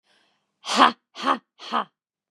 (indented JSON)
{
  "exhalation_length": "2.3 s",
  "exhalation_amplitude": 32213,
  "exhalation_signal_mean_std_ratio": 0.32,
  "survey_phase": "beta (2021-08-13 to 2022-03-07)",
  "age": "45-64",
  "gender": "Female",
  "wearing_mask": "No",
  "symptom_cough_any": true,
  "symptom_shortness_of_breath": true,
  "symptom_sore_throat": true,
  "symptom_fatigue": true,
  "symptom_change_to_sense_of_smell_or_taste": true,
  "symptom_onset": "4 days",
  "smoker_status": "Ex-smoker",
  "respiratory_condition_asthma": false,
  "respiratory_condition_other": false,
  "recruitment_source": "Test and Trace",
  "submission_delay": "2 days",
  "covid_test_result": "Positive",
  "covid_test_method": "RT-qPCR",
  "covid_ct_value": 27.4,
  "covid_ct_gene": "N gene"
}